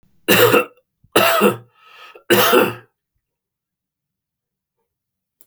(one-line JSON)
{"three_cough_length": "5.5 s", "three_cough_amplitude": 32767, "three_cough_signal_mean_std_ratio": 0.38, "survey_phase": "beta (2021-08-13 to 2022-03-07)", "age": "65+", "gender": "Male", "wearing_mask": "No", "symptom_cough_any": true, "symptom_runny_or_blocked_nose": true, "symptom_sore_throat": true, "smoker_status": "Never smoked", "respiratory_condition_asthma": false, "respiratory_condition_other": false, "recruitment_source": "Test and Trace", "submission_delay": "1 day", "covid_test_result": "Positive", "covid_test_method": "LFT"}